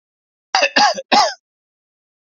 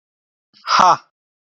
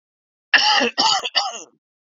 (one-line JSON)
{"three_cough_length": "2.2 s", "three_cough_amplitude": 30314, "three_cough_signal_mean_std_ratio": 0.41, "exhalation_length": "1.5 s", "exhalation_amplitude": 28240, "exhalation_signal_mean_std_ratio": 0.34, "cough_length": "2.1 s", "cough_amplitude": 29104, "cough_signal_mean_std_ratio": 0.51, "survey_phase": "beta (2021-08-13 to 2022-03-07)", "age": "45-64", "gender": "Male", "wearing_mask": "No", "symptom_diarrhoea": true, "symptom_fatigue": true, "symptom_headache": true, "symptom_onset": "3 days", "smoker_status": "Never smoked", "respiratory_condition_asthma": true, "respiratory_condition_other": false, "recruitment_source": "Test and Trace", "submission_delay": "1 day", "covid_test_result": "Positive", "covid_test_method": "RT-qPCR", "covid_ct_value": 16.3, "covid_ct_gene": "ORF1ab gene", "covid_ct_mean": 16.7, "covid_viral_load": "3300000 copies/ml", "covid_viral_load_category": "High viral load (>1M copies/ml)"}